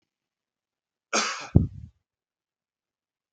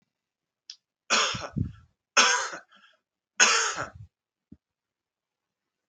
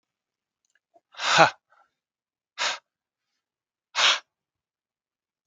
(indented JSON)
{
  "cough_length": "3.3 s",
  "cough_amplitude": 31987,
  "cough_signal_mean_std_ratio": 0.22,
  "three_cough_length": "5.9 s",
  "three_cough_amplitude": 19174,
  "three_cough_signal_mean_std_ratio": 0.34,
  "exhalation_length": "5.5 s",
  "exhalation_amplitude": 32604,
  "exhalation_signal_mean_std_ratio": 0.24,
  "survey_phase": "beta (2021-08-13 to 2022-03-07)",
  "age": "45-64",
  "gender": "Male",
  "wearing_mask": "No",
  "symptom_runny_or_blocked_nose": true,
  "symptom_fatigue": true,
  "symptom_change_to_sense_of_smell_or_taste": true,
  "symptom_loss_of_taste": true,
  "symptom_onset": "4 days",
  "smoker_status": "Never smoked",
  "respiratory_condition_asthma": false,
  "respiratory_condition_other": false,
  "recruitment_source": "Test and Trace",
  "submission_delay": "1 day",
  "covid_test_result": "Positive",
  "covid_test_method": "RT-qPCR"
}